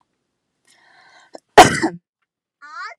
{"cough_length": "3.0 s", "cough_amplitude": 32768, "cough_signal_mean_std_ratio": 0.22, "survey_phase": "beta (2021-08-13 to 2022-03-07)", "age": "18-44", "gender": "Female", "wearing_mask": "No", "symptom_none": true, "smoker_status": "Ex-smoker", "respiratory_condition_asthma": false, "respiratory_condition_other": false, "recruitment_source": "REACT", "submission_delay": "1 day", "covid_test_result": "Negative", "covid_test_method": "RT-qPCR"}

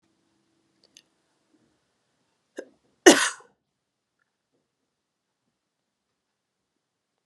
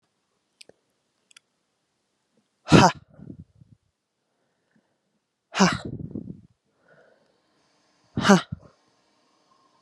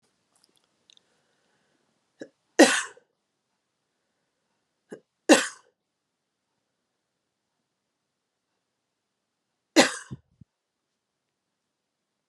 {"cough_length": "7.3 s", "cough_amplitude": 32765, "cough_signal_mean_std_ratio": 0.12, "exhalation_length": "9.8 s", "exhalation_amplitude": 32655, "exhalation_signal_mean_std_ratio": 0.2, "three_cough_length": "12.3 s", "three_cough_amplitude": 29594, "three_cough_signal_mean_std_ratio": 0.15, "survey_phase": "beta (2021-08-13 to 2022-03-07)", "age": "45-64", "gender": "Female", "wearing_mask": "No", "symptom_cough_any": true, "symptom_sore_throat": true, "symptom_fatigue": true, "symptom_headache": true, "symptom_onset": "4 days", "smoker_status": "Never smoked", "respiratory_condition_asthma": false, "respiratory_condition_other": false, "recruitment_source": "Test and Trace", "submission_delay": "2 days", "covid_test_result": "Positive", "covid_test_method": "RT-qPCR", "covid_ct_value": 33.5, "covid_ct_gene": "ORF1ab gene"}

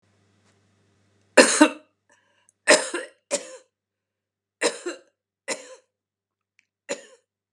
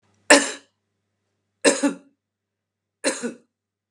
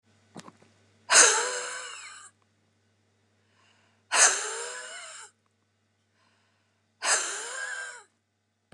{"cough_length": "7.5 s", "cough_amplitude": 31671, "cough_signal_mean_std_ratio": 0.23, "three_cough_length": "3.9 s", "three_cough_amplitude": 32767, "three_cough_signal_mean_std_ratio": 0.27, "exhalation_length": "8.7 s", "exhalation_amplitude": 20738, "exhalation_signal_mean_std_ratio": 0.33, "survey_phase": "beta (2021-08-13 to 2022-03-07)", "age": "65+", "gender": "Female", "wearing_mask": "No", "symptom_none": true, "smoker_status": "Ex-smoker", "respiratory_condition_asthma": false, "respiratory_condition_other": false, "recruitment_source": "REACT", "submission_delay": "3 days", "covid_test_result": "Negative", "covid_test_method": "RT-qPCR", "influenza_a_test_result": "Negative", "influenza_b_test_result": "Negative"}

